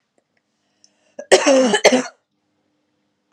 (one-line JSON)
{"cough_length": "3.3 s", "cough_amplitude": 32768, "cough_signal_mean_std_ratio": 0.35, "survey_phase": "beta (2021-08-13 to 2022-03-07)", "age": "18-44", "gender": "Female", "wearing_mask": "No", "symptom_cough_any": true, "symptom_runny_or_blocked_nose": true, "symptom_shortness_of_breath": true, "symptom_sore_throat": true, "symptom_fatigue": true, "symptom_headache": true, "symptom_change_to_sense_of_smell_or_taste": true, "symptom_onset": "9 days", "smoker_status": "Never smoked", "respiratory_condition_asthma": false, "respiratory_condition_other": false, "recruitment_source": "Test and Trace", "submission_delay": "1 day", "covid_test_result": "Positive", "covid_test_method": "RT-qPCR", "covid_ct_value": 26.0, "covid_ct_gene": "N gene"}